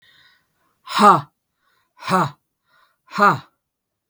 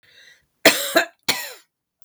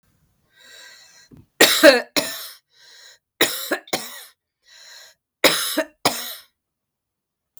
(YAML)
exhalation_length: 4.1 s
exhalation_amplitude: 32768
exhalation_signal_mean_std_ratio: 0.31
cough_length: 2.0 s
cough_amplitude: 32768
cough_signal_mean_std_ratio: 0.33
three_cough_length: 7.6 s
three_cough_amplitude: 32768
three_cough_signal_mean_std_ratio: 0.31
survey_phase: beta (2021-08-13 to 2022-03-07)
age: 65+
gender: Female
wearing_mask: 'No'
symptom_none: true
smoker_status: Never smoked
respiratory_condition_asthma: true
respiratory_condition_other: false
recruitment_source: REACT
submission_delay: 1 day
covid_test_result: Negative
covid_test_method: RT-qPCR